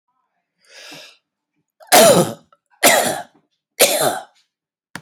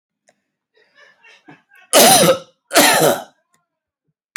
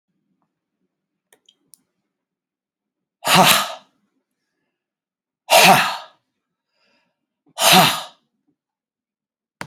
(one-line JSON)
{"three_cough_length": "5.0 s", "three_cough_amplitude": 32768, "three_cough_signal_mean_std_ratio": 0.37, "cough_length": "4.4 s", "cough_amplitude": 32768, "cough_signal_mean_std_ratio": 0.38, "exhalation_length": "9.7 s", "exhalation_amplitude": 32768, "exhalation_signal_mean_std_ratio": 0.28, "survey_phase": "alpha (2021-03-01 to 2021-08-12)", "age": "45-64", "gender": "Male", "wearing_mask": "No", "symptom_none": true, "smoker_status": "Ex-smoker", "respiratory_condition_asthma": false, "respiratory_condition_other": false, "recruitment_source": "REACT", "submission_delay": "1 day", "covid_test_result": "Negative", "covid_test_method": "RT-qPCR"}